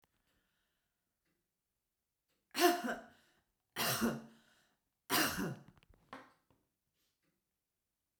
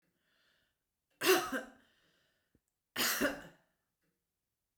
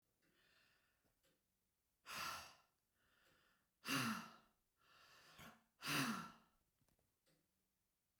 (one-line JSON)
{"three_cough_length": "8.2 s", "three_cough_amplitude": 5638, "three_cough_signal_mean_std_ratio": 0.3, "cough_length": "4.8 s", "cough_amplitude": 6169, "cough_signal_mean_std_ratio": 0.3, "exhalation_length": "8.2 s", "exhalation_amplitude": 1191, "exhalation_signal_mean_std_ratio": 0.33, "survey_phase": "beta (2021-08-13 to 2022-03-07)", "age": "65+", "gender": "Female", "wearing_mask": "No", "symptom_none": true, "smoker_status": "Ex-smoker", "respiratory_condition_asthma": false, "respiratory_condition_other": false, "recruitment_source": "REACT", "submission_delay": "1 day", "covid_test_result": "Negative", "covid_test_method": "RT-qPCR"}